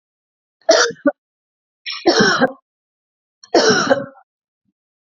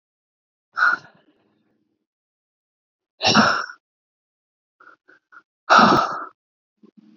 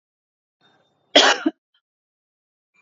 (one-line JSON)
{"three_cough_length": "5.1 s", "three_cough_amplitude": 28468, "three_cough_signal_mean_std_ratio": 0.4, "exhalation_length": "7.2 s", "exhalation_amplitude": 28741, "exhalation_signal_mean_std_ratio": 0.3, "cough_length": "2.8 s", "cough_amplitude": 29713, "cough_signal_mean_std_ratio": 0.23, "survey_phase": "beta (2021-08-13 to 2022-03-07)", "age": "18-44", "gender": "Female", "wearing_mask": "No", "symptom_none": true, "smoker_status": "Ex-smoker", "respiratory_condition_asthma": false, "respiratory_condition_other": false, "recruitment_source": "REACT", "submission_delay": "5 days", "covid_test_result": "Positive", "covid_test_method": "RT-qPCR", "covid_ct_value": 37.0, "covid_ct_gene": "N gene", "influenza_a_test_result": "Negative", "influenza_b_test_result": "Negative"}